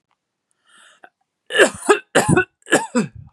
{"cough_length": "3.3 s", "cough_amplitude": 32768, "cough_signal_mean_std_ratio": 0.38, "survey_phase": "beta (2021-08-13 to 2022-03-07)", "age": "18-44", "gender": "Female", "wearing_mask": "No", "symptom_none": true, "smoker_status": "Never smoked", "respiratory_condition_asthma": false, "respiratory_condition_other": false, "recruitment_source": "REACT", "submission_delay": "1 day", "covid_test_result": "Negative", "covid_test_method": "RT-qPCR", "influenza_a_test_result": "Negative", "influenza_b_test_result": "Negative"}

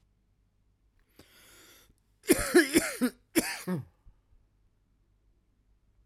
{"cough_length": "6.1 s", "cough_amplitude": 11686, "cough_signal_mean_std_ratio": 0.29, "survey_phase": "beta (2021-08-13 to 2022-03-07)", "age": "45-64", "gender": "Male", "wearing_mask": "Yes", "symptom_cough_any": true, "symptom_new_continuous_cough": true, "symptom_runny_or_blocked_nose": true, "symptom_sore_throat": true, "symptom_abdominal_pain": true, "symptom_fatigue": true, "symptom_fever_high_temperature": true, "symptom_headache": true, "symptom_change_to_sense_of_smell_or_taste": true, "symptom_loss_of_taste": true, "symptom_other": true, "symptom_onset": "3 days", "smoker_status": "Ex-smoker", "respiratory_condition_asthma": true, "respiratory_condition_other": false, "recruitment_source": "Test and Trace", "submission_delay": "2 days", "covid_test_result": "Positive", "covid_test_method": "RT-qPCR", "covid_ct_value": 18.9, "covid_ct_gene": "N gene"}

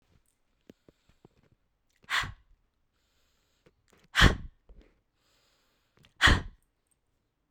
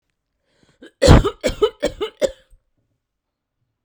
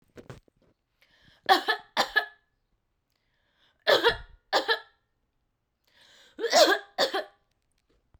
{"exhalation_length": "7.5 s", "exhalation_amplitude": 16394, "exhalation_signal_mean_std_ratio": 0.2, "cough_length": "3.8 s", "cough_amplitude": 32768, "cough_signal_mean_std_ratio": 0.29, "three_cough_length": "8.2 s", "three_cough_amplitude": 18433, "three_cough_signal_mean_std_ratio": 0.32, "survey_phase": "beta (2021-08-13 to 2022-03-07)", "age": "18-44", "gender": "Female", "wearing_mask": "No", "symptom_cough_any": true, "symptom_runny_or_blocked_nose": true, "symptom_fatigue": true, "symptom_other": true, "smoker_status": "Ex-smoker", "respiratory_condition_asthma": false, "respiratory_condition_other": false, "recruitment_source": "Test and Trace", "submission_delay": "1 day", "covid_test_result": "Positive", "covid_test_method": "LFT"}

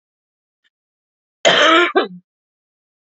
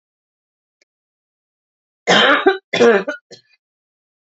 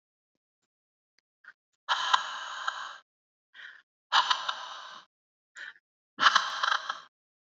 {"cough_length": "3.2 s", "cough_amplitude": 30275, "cough_signal_mean_std_ratio": 0.34, "three_cough_length": "4.4 s", "three_cough_amplitude": 29837, "three_cough_signal_mean_std_ratio": 0.34, "exhalation_length": "7.6 s", "exhalation_amplitude": 20041, "exhalation_signal_mean_std_ratio": 0.35, "survey_phase": "beta (2021-08-13 to 2022-03-07)", "age": "18-44", "gender": "Female", "wearing_mask": "No", "symptom_none": true, "smoker_status": "Never smoked", "respiratory_condition_asthma": false, "respiratory_condition_other": false, "recruitment_source": "REACT", "submission_delay": "1 day", "covid_test_result": "Negative", "covid_test_method": "RT-qPCR", "influenza_a_test_result": "Negative", "influenza_b_test_result": "Negative"}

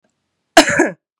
{"cough_length": "1.2 s", "cough_amplitude": 32768, "cough_signal_mean_std_ratio": 0.36, "survey_phase": "beta (2021-08-13 to 2022-03-07)", "age": "18-44", "gender": "Female", "wearing_mask": "No", "symptom_runny_or_blocked_nose": true, "symptom_sore_throat": true, "symptom_onset": "4 days", "smoker_status": "Never smoked", "respiratory_condition_asthma": false, "respiratory_condition_other": false, "recruitment_source": "Test and Trace", "submission_delay": "2 days", "covid_test_result": "Negative", "covid_test_method": "RT-qPCR"}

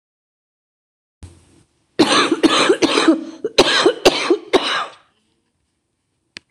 {"cough_length": "6.5 s", "cough_amplitude": 26028, "cough_signal_mean_std_ratio": 0.45, "survey_phase": "beta (2021-08-13 to 2022-03-07)", "age": "65+", "gender": "Female", "wearing_mask": "Yes", "symptom_cough_any": true, "symptom_new_continuous_cough": true, "symptom_shortness_of_breath": true, "symptom_onset": "12 days", "smoker_status": "Ex-smoker", "respiratory_condition_asthma": false, "respiratory_condition_other": true, "recruitment_source": "REACT", "submission_delay": "1 day", "covid_test_result": "Negative", "covid_test_method": "RT-qPCR", "influenza_a_test_result": "Negative", "influenza_b_test_result": "Negative"}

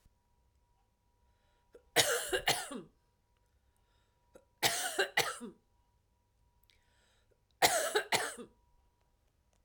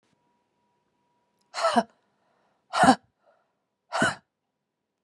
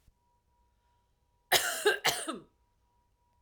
{"three_cough_length": "9.6 s", "three_cough_amplitude": 9271, "three_cough_signal_mean_std_ratio": 0.34, "exhalation_length": "5.0 s", "exhalation_amplitude": 24979, "exhalation_signal_mean_std_ratio": 0.26, "cough_length": "3.4 s", "cough_amplitude": 11027, "cough_signal_mean_std_ratio": 0.33, "survey_phase": "alpha (2021-03-01 to 2021-08-12)", "age": "45-64", "gender": "Female", "wearing_mask": "No", "symptom_none": true, "smoker_status": "Ex-smoker", "respiratory_condition_asthma": false, "respiratory_condition_other": false, "recruitment_source": "REACT", "submission_delay": "1 day", "covid_test_result": "Negative", "covid_test_method": "RT-qPCR"}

